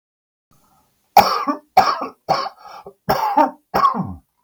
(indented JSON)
{
  "cough_length": "4.4 s",
  "cough_amplitude": 32768,
  "cough_signal_mean_std_ratio": 0.45,
  "survey_phase": "beta (2021-08-13 to 2022-03-07)",
  "age": "65+",
  "gender": "Male",
  "wearing_mask": "No",
  "symptom_none": true,
  "smoker_status": "Ex-smoker",
  "respiratory_condition_asthma": true,
  "respiratory_condition_other": false,
  "recruitment_source": "REACT",
  "submission_delay": "3 days",
  "covid_test_result": "Negative",
  "covid_test_method": "RT-qPCR",
  "influenza_a_test_result": "Negative",
  "influenza_b_test_result": "Negative"
}